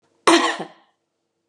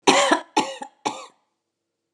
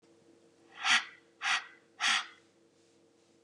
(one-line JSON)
{"cough_length": "1.5 s", "cough_amplitude": 31553, "cough_signal_mean_std_ratio": 0.35, "three_cough_length": "2.1 s", "three_cough_amplitude": 30994, "three_cough_signal_mean_std_ratio": 0.39, "exhalation_length": "3.4 s", "exhalation_amplitude": 7224, "exhalation_signal_mean_std_ratio": 0.36, "survey_phase": "beta (2021-08-13 to 2022-03-07)", "age": "45-64", "gender": "Female", "wearing_mask": "No", "symptom_none": true, "smoker_status": "Prefer not to say", "respiratory_condition_asthma": false, "respiratory_condition_other": false, "recruitment_source": "Test and Trace", "submission_delay": "1 day", "covid_test_result": "Positive", "covid_test_method": "LFT"}